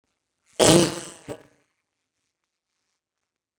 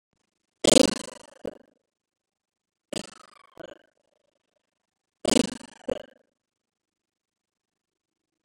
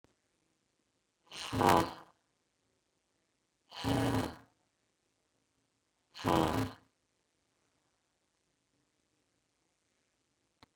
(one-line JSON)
{"cough_length": "3.6 s", "cough_amplitude": 28598, "cough_signal_mean_std_ratio": 0.19, "three_cough_length": "8.4 s", "three_cough_amplitude": 29762, "three_cough_signal_mean_std_ratio": 0.17, "exhalation_length": "10.8 s", "exhalation_amplitude": 9985, "exhalation_signal_mean_std_ratio": 0.21, "survey_phase": "beta (2021-08-13 to 2022-03-07)", "age": "45-64", "gender": "Female", "wearing_mask": "No", "symptom_none": true, "smoker_status": "Never smoked", "respiratory_condition_asthma": true, "respiratory_condition_other": false, "recruitment_source": "REACT", "submission_delay": "2 days", "covid_test_result": "Negative", "covid_test_method": "RT-qPCR", "influenza_a_test_result": "Negative", "influenza_b_test_result": "Negative"}